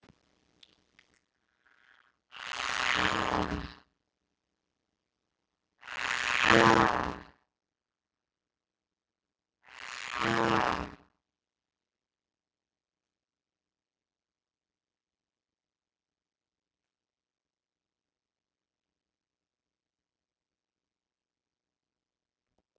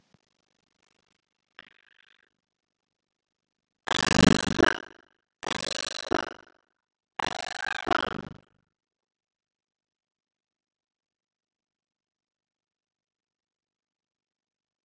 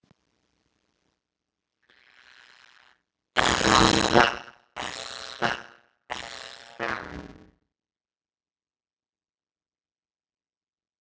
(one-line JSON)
{"exhalation_length": "22.8 s", "exhalation_amplitude": 15146, "exhalation_signal_mean_std_ratio": 0.17, "three_cough_length": "14.8 s", "three_cough_amplitude": 20565, "three_cough_signal_mean_std_ratio": 0.17, "cough_length": "11.0 s", "cough_amplitude": 27683, "cough_signal_mean_std_ratio": 0.18, "survey_phase": "beta (2021-08-13 to 2022-03-07)", "age": "45-64", "gender": "Female", "wearing_mask": "No", "symptom_none": true, "smoker_status": "Ex-smoker", "respiratory_condition_asthma": false, "respiratory_condition_other": false, "recruitment_source": "REACT", "submission_delay": "0 days", "covid_test_result": "Negative", "covid_test_method": "RT-qPCR", "influenza_a_test_result": "Negative", "influenza_b_test_result": "Negative"}